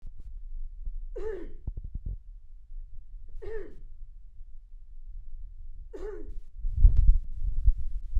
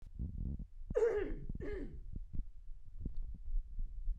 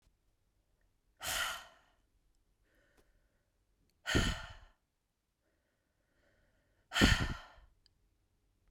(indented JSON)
{
  "three_cough_length": "8.2 s",
  "three_cough_amplitude": 16153,
  "three_cough_signal_mean_std_ratio": 0.54,
  "cough_length": "4.2 s",
  "cough_amplitude": 2646,
  "cough_signal_mean_std_ratio": 0.9,
  "exhalation_length": "8.7 s",
  "exhalation_amplitude": 7383,
  "exhalation_signal_mean_std_ratio": 0.26,
  "survey_phase": "beta (2021-08-13 to 2022-03-07)",
  "age": "18-44",
  "gender": "Female",
  "wearing_mask": "No",
  "symptom_none": true,
  "symptom_onset": "12 days",
  "smoker_status": "Never smoked",
  "respiratory_condition_asthma": false,
  "respiratory_condition_other": false,
  "recruitment_source": "REACT",
  "submission_delay": "2 days",
  "covid_test_result": "Negative",
  "covid_test_method": "RT-qPCR"
}